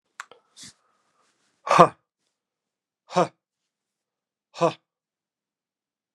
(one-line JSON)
{"exhalation_length": "6.1 s", "exhalation_amplitude": 32768, "exhalation_signal_mean_std_ratio": 0.18, "survey_phase": "beta (2021-08-13 to 2022-03-07)", "age": "65+", "gender": "Male", "wearing_mask": "No", "symptom_cough_any": true, "smoker_status": "Never smoked", "respiratory_condition_asthma": false, "respiratory_condition_other": false, "recruitment_source": "REACT", "submission_delay": "2 days", "covid_test_result": "Negative", "covid_test_method": "RT-qPCR"}